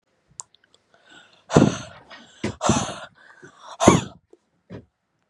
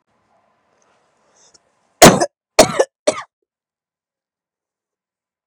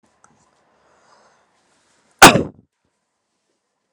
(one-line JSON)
{"exhalation_length": "5.3 s", "exhalation_amplitude": 32768, "exhalation_signal_mean_std_ratio": 0.29, "three_cough_length": "5.5 s", "three_cough_amplitude": 32768, "three_cough_signal_mean_std_ratio": 0.21, "cough_length": "3.9 s", "cough_amplitude": 32768, "cough_signal_mean_std_ratio": 0.17, "survey_phase": "beta (2021-08-13 to 2022-03-07)", "age": "18-44", "gender": "Male", "wearing_mask": "Yes", "symptom_none": true, "smoker_status": "Never smoked", "respiratory_condition_asthma": false, "respiratory_condition_other": false, "recruitment_source": "REACT", "submission_delay": "1 day", "covid_test_result": "Negative", "covid_test_method": "RT-qPCR", "influenza_a_test_result": "Negative", "influenza_b_test_result": "Negative"}